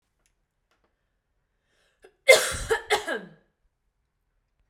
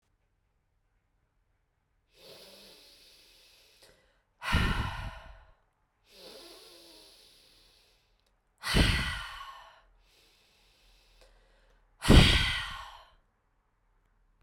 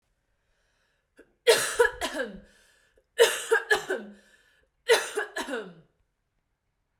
cough_length: 4.7 s
cough_amplitude: 29314
cough_signal_mean_std_ratio: 0.23
exhalation_length: 14.4 s
exhalation_amplitude: 16703
exhalation_signal_mean_std_ratio: 0.26
three_cough_length: 7.0 s
three_cough_amplitude: 16353
three_cough_signal_mean_std_ratio: 0.35
survey_phase: beta (2021-08-13 to 2022-03-07)
age: 18-44
gender: Female
wearing_mask: 'No'
symptom_cough_any: true
symptom_runny_or_blocked_nose: true
symptom_sore_throat: true
symptom_fatigue: true
symptom_headache: true
symptom_change_to_sense_of_smell_or_taste: true
symptom_onset: 5 days
smoker_status: Ex-smoker
respiratory_condition_asthma: false
respiratory_condition_other: false
recruitment_source: Test and Trace
submission_delay: 2 days
covid_test_result: Positive
covid_test_method: RT-qPCR
covid_ct_value: 32.2
covid_ct_gene: N gene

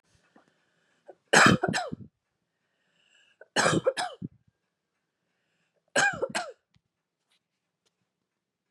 three_cough_length: 8.7 s
three_cough_amplitude: 17675
three_cough_signal_mean_std_ratio: 0.28
survey_phase: beta (2021-08-13 to 2022-03-07)
age: 45-64
gender: Female
wearing_mask: 'No'
symptom_cough_any: true
symptom_onset: 2 days
smoker_status: Never smoked
respiratory_condition_asthma: false
respiratory_condition_other: false
recruitment_source: Test and Trace
submission_delay: 1 day
covid_test_result: Negative
covid_test_method: RT-qPCR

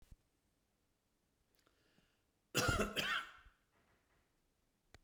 cough_length: 5.0 s
cough_amplitude: 3190
cough_signal_mean_std_ratio: 0.3
survey_phase: beta (2021-08-13 to 2022-03-07)
age: 65+
gender: Male
wearing_mask: 'No'
symptom_none: true
smoker_status: Ex-smoker
respiratory_condition_asthma: true
respiratory_condition_other: false
recruitment_source: REACT
submission_delay: 1 day
covid_test_result: Negative
covid_test_method: RT-qPCR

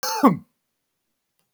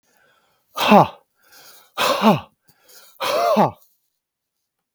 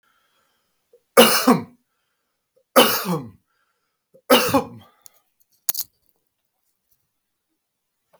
cough_length: 1.5 s
cough_amplitude: 24200
cough_signal_mean_std_ratio: 0.3
exhalation_length: 4.9 s
exhalation_amplitude: 32768
exhalation_signal_mean_std_ratio: 0.37
three_cough_length: 8.2 s
three_cough_amplitude: 32768
three_cough_signal_mean_std_ratio: 0.28
survey_phase: beta (2021-08-13 to 2022-03-07)
age: 45-64
gender: Male
wearing_mask: 'No'
symptom_none: true
smoker_status: Never smoked
respiratory_condition_asthma: false
respiratory_condition_other: false
recruitment_source: REACT
submission_delay: 2 days
covid_test_result: Negative
covid_test_method: RT-qPCR
influenza_a_test_result: Negative
influenza_b_test_result: Negative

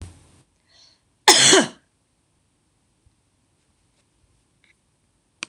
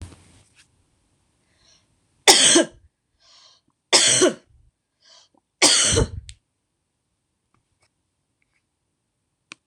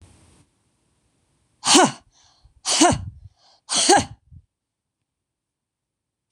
cough_length: 5.5 s
cough_amplitude: 26028
cough_signal_mean_std_ratio: 0.22
three_cough_length: 9.7 s
three_cough_amplitude: 26028
three_cough_signal_mean_std_ratio: 0.29
exhalation_length: 6.3 s
exhalation_amplitude: 26027
exhalation_signal_mean_std_ratio: 0.3
survey_phase: beta (2021-08-13 to 2022-03-07)
age: 45-64
gender: Female
wearing_mask: 'No'
symptom_runny_or_blocked_nose: true
smoker_status: Never smoked
respiratory_condition_asthma: false
respiratory_condition_other: false
recruitment_source: REACT
submission_delay: 0 days
covid_test_result: Negative
covid_test_method: RT-qPCR
influenza_a_test_result: Negative
influenza_b_test_result: Negative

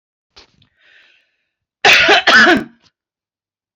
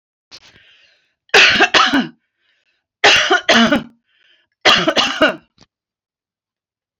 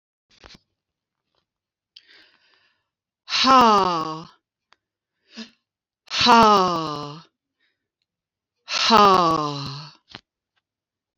cough_length: 3.8 s
cough_amplitude: 30004
cough_signal_mean_std_ratio: 0.39
three_cough_length: 7.0 s
three_cough_amplitude: 31770
three_cough_signal_mean_std_ratio: 0.43
exhalation_length: 11.2 s
exhalation_amplitude: 25805
exhalation_signal_mean_std_ratio: 0.37
survey_phase: beta (2021-08-13 to 2022-03-07)
age: 45-64
gender: Female
wearing_mask: 'No'
symptom_cough_any: true
symptom_onset: 10 days
smoker_status: Never smoked
respiratory_condition_asthma: false
respiratory_condition_other: false
recruitment_source: REACT
submission_delay: 2 days
covid_test_result: Negative
covid_test_method: RT-qPCR
influenza_a_test_result: Unknown/Void
influenza_b_test_result: Unknown/Void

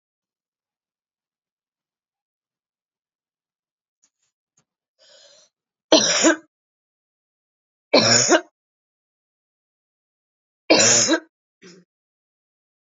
three_cough_length: 12.9 s
three_cough_amplitude: 28395
three_cough_signal_mean_std_ratio: 0.26
survey_phase: alpha (2021-03-01 to 2021-08-12)
age: 45-64
gender: Female
wearing_mask: 'No'
symptom_cough_any: true
symptom_shortness_of_breath: true
symptom_abdominal_pain: true
symptom_fatigue: true
symptom_change_to_sense_of_smell_or_taste: true
symptom_onset: 5 days
smoker_status: Ex-smoker
respiratory_condition_asthma: false
respiratory_condition_other: false
recruitment_source: Test and Trace
submission_delay: 1 day
covid_test_result: Positive
covid_test_method: RT-qPCR
covid_ct_value: 15.1
covid_ct_gene: ORF1ab gene
covid_ct_mean: 15.6
covid_viral_load: 7800000 copies/ml
covid_viral_load_category: High viral load (>1M copies/ml)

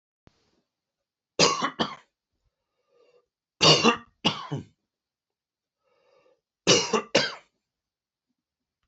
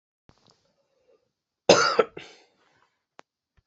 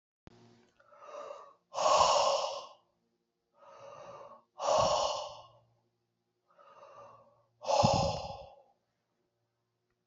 three_cough_length: 8.9 s
three_cough_amplitude: 22448
three_cough_signal_mean_std_ratio: 0.29
cough_length: 3.7 s
cough_amplitude: 26942
cough_signal_mean_std_ratio: 0.22
exhalation_length: 10.1 s
exhalation_amplitude: 7311
exhalation_signal_mean_std_ratio: 0.4
survey_phase: beta (2021-08-13 to 2022-03-07)
age: 45-64
gender: Male
wearing_mask: 'No'
symptom_cough_any: true
symptom_headache: true
smoker_status: Never smoked
respiratory_condition_asthma: false
respiratory_condition_other: false
recruitment_source: Test and Trace
submission_delay: 2 days
covid_test_result: Positive
covid_test_method: RT-qPCR
covid_ct_value: 29.6
covid_ct_gene: ORF1ab gene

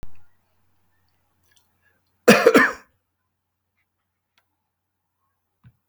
cough_length: 5.9 s
cough_amplitude: 32768
cough_signal_mean_std_ratio: 0.22
survey_phase: beta (2021-08-13 to 2022-03-07)
age: 65+
gender: Male
wearing_mask: 'No'
symptom_none: true
smoker_status: Ex-smoker
respiratory_condition_asthma: false
respiratory_condition_other: false
recruitment_source: REACT
submission_delay: 3 days
covid_test_result: Negative
covid_test_method: RT-qPCR
influenza_a_test_result: Negative
influenza_b_test_result: Negative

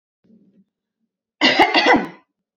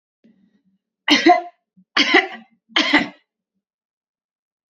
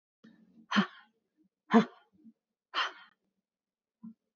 cough_length: 2.6 s
cough_amplitude: 29331
cough_signal_mean_std_ratio: 0.39
three_cough_length: 4.7 s
three_cough_amplitude: 30605
three_cough_signal_mean_std_ratio: 0.33
exhalation_length: 4.4 s
exhalation_amplitude: 11370
exhalation_signal_mean_std_ratio: 0.23
survey_phase: beta (2021-08-13 to 2022-03-07)
age: 18-44
gender: Female
wearing_mask: 'No'
symptom_runny_or_blocked_nose: true
symptom_onset: 12 days
smoker_status: Never smoked
respiratory_condition_asthma: false
respiratory_condition_other: false
recruitment_source: REACT
submission_delay: 2 days
covid_test_result: Negative
covid_test_method: RT-qPCR
influenza_a_test_result: Negative
influenza_b_test_result: Negative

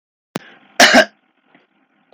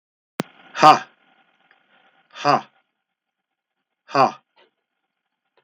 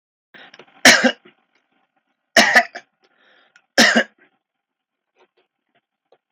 cough_length: 2.1 s
cough_amplitude: 32768
cough_signal_mean_std_ratio: 0.29
exhalation_length: 5.6 s
exhalation_amplitude: 32768
exhalation_signal_mean_std_ratio: 0.22
three_cough_length: 6.3 s
three_cough_amplitude: 32768
three_cough_signal_mean_std_ratio: 0.27
survey_phase: beta (2021-08-13 to 2022-03-07)
age: 45-64
gender: Male
wearing_mask: 'No'
symptom_change_to_sense_of_smell_or_taste: true
symptom_onset: 4 days
smoker_status: Never smoked
respiratory_condition_asthma: false
respiratory_condition_other: false
recruitment_source: Test and Trace
submission_delay: 1 day
covid_test_result: Positive
covid_test_method: RT-qPCR
covid_ct_value: 27.4
covid_ct_gene: S gene
covid_ct_mean: 27.5
covid_viral_load: 970 copies/ml
covid_viral_load_category: Minimal viral load (< 10K copies/ml)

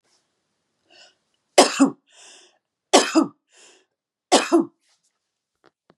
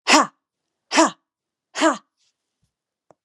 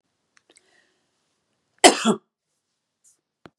three_cough_length: 6.0 s
three_cough_amplitude: 32768
three_cough_signal_mean_std_ratio: 0.27
exhalation_length: 3.2 s
exhalation_amplitude: 32767
exhalation_signal_mean_std_ratio: 0.31
cough_length: 3.6 s
cough_amplitude: 32768
cough_signal_mean_std_ratio: 0.18
survey_phase: beta (2021-08-13 to 2022-03-07)
age: 45-64
gender: Female
wearing_mask: 'No'
symptom_none: true
smoker_status: Never smoked
respiratory_condition_asthma: false
respiratory_condition_other: false
recruitment_source: REACT
submission_delay: 2 days
covid_test_result: Negative
covid_test_method: RT-qPCR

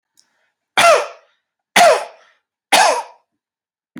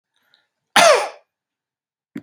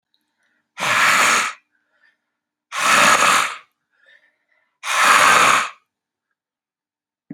three_cough_length: 4.0 s
three_cough_amplitude: 32617
three_cough_signal_mean_std_ratio: 0.38
cough_length: 2.2 s
cough_amplitude: 30160
cough_signal_mean_std_ratio: 0.3
exhalation_length: 7.3 s
exhalation_amplitude: 32768
exhalation_signal_mean_std_ratio: 0.47
survey_phase: beta (2021-08-13 to 2022-03-07)
age: 45-64
gender: Male
wearing_mask: 'No'
symptom_sore_throat: true
symptom_fatigue: true
symptom_headache: true
smoker_status: Current smoker (e-cigarettes or vapes only)
respiratory_condition_asthma: false
respiratory_condition_other: false
recruitment_source: Test and Trace
submission_delay: 2 days
covid_test_result: Positive
covid_test_method: RT-qPCR
covid_ct_value: 29.1
covid_ct_gene: ORF1ab gene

